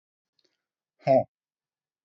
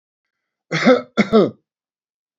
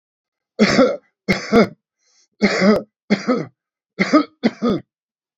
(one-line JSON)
{"exhalation_length": "2.0 s", "exhalation_amplitude": 10188, "exhalation_signal_mean_std_ratio": 0.22, "cough_length": "2.4 s", "cough_amplitude": 27974, "cough_signal_mean_std_ratio": 0.36, "three_cough_length": "5.4 s", "three_cough_amplitude": 27454, "three_cough_signal_mean_std_ratio": 0.45, "survey_phase": "beta (2021-08-13 to 2022-03-07)", "age": "65+", "gender": "Male", "wearing_mask": "No", "symptom_none": true, "symptom_onset": "12 days", "smoker_status": "Ex-smoker", "respiratory_condition_asthma": false, "respiratory_condition_other": false, "recruitment_source": "REACT", "submission_delay": "2 days", "covid_test_result": "Negative", "covid_test_method": "RT-qPCR", "influenza_a_test_result": "Negative", "influenza_b_test_result": "Negative"}